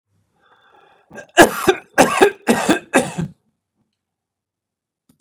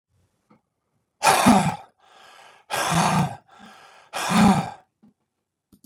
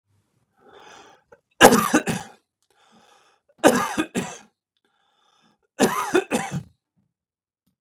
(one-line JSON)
{"cough_length": "5.2 s", "cough_amplitude": 32768, "cough_signal_mean_std_ratio": 0.33, "exhalation_length": "5.9 s", "exhalation_amplitude": 27901, "exhalation_signal_mean_std_ratio": 0.41, "three_cough_length": "7.8 s", "three_cough_amplitude": 32768, "three_cough_signal_mean_std_ratio": 0.3, "survey_phase": "beta (2021-08-13 to 2022-03-07)", "age": "45-64", "gender": "Male", "wearing_mask": "No", "symptom_none": true, "smoker_status": "Never smoked", "respiratory_condition_asthma": false, "respiratory_condition_other": false, "recruitment_source": "REACT", "submission_delay": "1 day", "covid_test_result": "Negative", "covid_test_method": "RT-qPCR", "influenza_a_test_result": "Unknown/Void", "influenza_b_test_result": "Unknown/Void"}